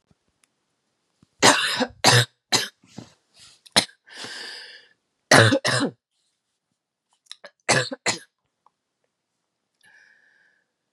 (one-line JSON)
{"three_cough_length": "10.9 s", "three_cough_amplitude": 32440, "three_cough_signal_mean_std_ratio": 0.3, "survey_phase": "beta (2021-08-13 to 2022-03-07)", "age": "18-44", "gender": "Female", "wearing_mask": "No", "symptom_cough_any": true, "symptom_new_continuous_cough": true, "symptom_shortness_of_breath": true, "symptom_fatigue": true, "symptom_headache": true, "symptom_onset": "3 days", "smoker_status": "Never smoked", "respiratory_condition_asthma": false, "respiratory_condition_other": false, "recruitment_source": "Test and Trace", "submission_delay": "2 days", "covid_test_result": "Positive", "covid_test_method": "RT-qPCR", "covid_ct_value": 15.7, "covid_ct_gene": "ORF1ab gene"}